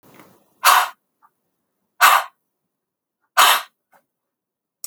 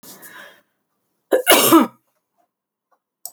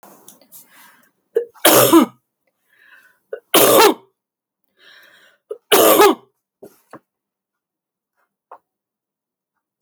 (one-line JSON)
{"exhalation_length": "4.9 s", "exhalation_amplitude": 32768, "exhalation_signal_mean_std_ratio": 0.3, "cough_length": "3.3 s", "cough_amplitude": 32768, "cough_signal_mean_std_ratio": 0.32, "three_cough_length": "9.8 s", "three_cough_amplitude": 32768, "three_cough_signal_mean_std_ratio": 0.31, "survey_phase": "alpha (2021-03-01 to 2021-08-12)", "age": "45-64", "gender": "Female", "wearing_mask": "No", "symptom_none": true, "smoker_status": "Never smoked", "respiratory_condition_asthma": false, "respiratory_condition_other": false, "recruitment_source": "REACT", "submission_delay": "2 days", "covid_test_result": "Negative", "covid_test_method": "RT-qPCR"}